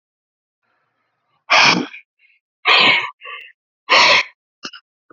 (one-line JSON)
{"exhalation_length": "5.1 s", "exhalation_amplitude": 32768, "exhalation_signal_mean_std_ratio": 0.39, "survey_phase": "beta (2021-08-13 to 2022-03-07)", "age": "18-44", "gender": "Male", "wearing_mask": "No", "symptom_cough_any": true, "symptom_new_continuous_cough": true, "symptom_runny_or_blocked_nose": true, "symptom_shortness_of_breath": true, "symptom_sore_throat": true, "symptom_fatigue": true, "symptom_headache": true, "symptom_change_to_sense_of_smell_or_taste": true, "symptom_loss_of_taste": true, "symptom_other": true, "smoker_status": "Ex-smoker", "respiratory_condition_asthma": false, "respiratory_condition_other": false, "recruitment_source": "Test and Trace", "submission_delay": "0 days", "covid_test_result": "Positive", "covid_test_method": "LFT"}